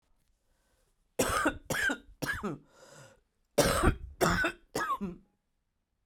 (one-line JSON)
{"cough_length": "6.1 s", "cough_amplitude": 9163, "cough_signal_mean_std_ratio": 0.46, "survey_phase": "beta (2021-08-13 to 2022-03-07)", "age": "45-64", "gender": "Female", "wearing_mask": "No", "symptom_cough_any": true, "symptom_runny_or_blocked_nose": true, "symptom_sore_throat": true, "symptom_abdominal_pain": true, "symptom_diarrhoea": true, "symptom_fatigue": true, "symptom_headache": true, "symptom_onset": "3 days", "smoker_status": "Current smoker (e-cigarettes or vapes only)", "respiratory_condition_asthma": false, "respiratory_condition_other": false, "recruitment_source": "Test and Trace", "submission_delay": "2 days", "covid_test_result": "Positive", "covid_test_method": "RT-qPCR", "covid_ct_value": 17.3, "covid_ct_gene": "ORF1ab gene", "covid_ct_mean": 18.4, "covid_viral_load": "920000 copies/ml", "covid_viral_load_category": "Low viral load (10K-1M copies/ml)"}